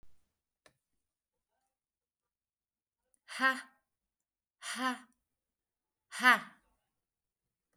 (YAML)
exhalation_length: 7.8 s
exhalation_amplitude: 8912
exhalation_signal_mean_std_ratio: 0.2
survey_phase: beta (2021-08-13 to 2022-03-07)
age: 45-64
gender: Female
wearing_mask: 'No'
symptom_none: true
smoker_status: Ex-smoker
respiratory_condition_asthma: false
respiratory_condition_other: false
recruitment_source: REACT
submission_delay: 5 days
covid_test_result: Negative
covid_test_method: RT-qPCR